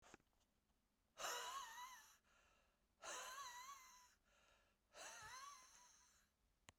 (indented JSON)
{
  "exhalation_length": "6.8 s",
  "exhalation_amplitude": 521,
  "exhalation_signal_mean_std_ratio": 0.55,
  "survey_phase": "beta (2021-08-13 to 2022-03-07)",
  "age": "65+",
  "gender": "Male",
  "wearing_mask": "No",
  "symptom_cough_any": true,
  "symptom_runny_or_blocked_nose": true,
  "symptom_fatigue": true,
  "symptom_loss_of_taste": true,
  "symptom_onset": "2 days",
  "smoker_status": "Never smoked",
  "respiratory_condition_asthma": false,
  "respiratory_condition_other": false,
  "recruitment_source": "Test and Trace",
  "submission_delay": "1 day",
  "covid_test_result": "Positive",
  "covid_test_method": "RT-qPCR",
  "covid_ct_value": 17.3,
  "covid_ct_gene": "ORF1ab gene",
  "covid_ct_mean": 17.6,
  "covid_viral_load": "1700000 copies/ml",
  "covid_viral_load_category": "High viral load (>1M copies/ml)"
}